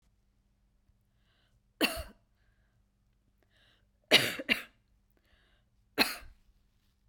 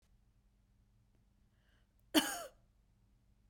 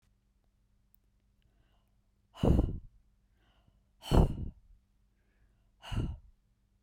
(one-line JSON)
{"three_cough_length": "7.1 s", "three_cough_amplitude": 15711, "three_cough_signal_mean_std_ratio": 0.22, "cough_length": "3.5 s", "cough_amplitude": 5758, "cough_signal_mean_std_ratio": 0.21, "exhalation_length": "6.8 s", "exhalation_amplitude": 9527, "exhalation_signal_mean_std_ratio": 0.27, "survey_phase": "beta (2021-08-13 to 2022-03-07)", "age": "18-44", "gender": "Female", "wearing_mask": "No", "symptom_none": true, "symptom_onset": "12 days", "smoker_status": "Never smoked", "respiratory_condition_asthma": false, "respiratory_condition_other": false, "recruitment_source": "REACT", "submission_delay": "1 day", "covid_test_result": "Negative", "covid_test_method": "RT-qPCR"}